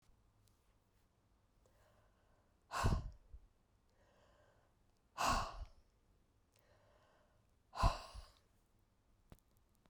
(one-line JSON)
{"exhalation_length": "9.9 s", "exhalation_amplitude": 3500, "exhalation_signal_mean_std_ratio": 0.27, "survey_phase": "beta (2021-08-13 to 2022-03-07)", "age": "45-64", "gender": "Female", "wearing_mask": "No", "symptom_cough_any": true, "symptom_runny_or_blocked_nose": true, "symptom_sore_throat": true, "symptom_fatigue": true, "symptom_headache": true, "symptom_change_to_sense_of_smell_or_taste": true, "symptom_onset": "10 days", "smoker_status": "Ex-smoker", "respiratory_condition_asthma": false, "respiratory_condition_other": false, "recruitment_source": "Test and Trace", "submission_delay": "2 days", "covid_test_result": "Positive", "covid_test_method": "RT-qPCR", "covid_ct_value": 16.2, "covid_ct_gene": "ORF1ab gene", "covid_ct_mean": 16.8, "covid_viral_load": "3100000 copies/ml", "covid_viral_load_category": "High viral load (>1M copies/ml)"}